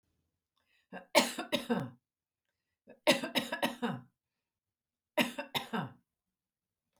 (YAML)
three_cough_length: 7.0 s
three_cough_amplitude: 11499
three_cough_signal_mean_std_ratio: 0.34
survey_phase: beta (2021-08-13 to 2022-03-07)
age: 65+
gender: Female
wearing_mask: 'No'
symptom_none: true
smoker_status: Never smoked
respiratory_condition_asthma: false
respiratory_condition_other: false
recruitment_source: REACT
submission_delay: 2 days
covid_test_result: Negative
covid_test_method: RT-qPCR
influenza_a_test_result: Unknown/Void
influenza_b_test_result: Unknown/Void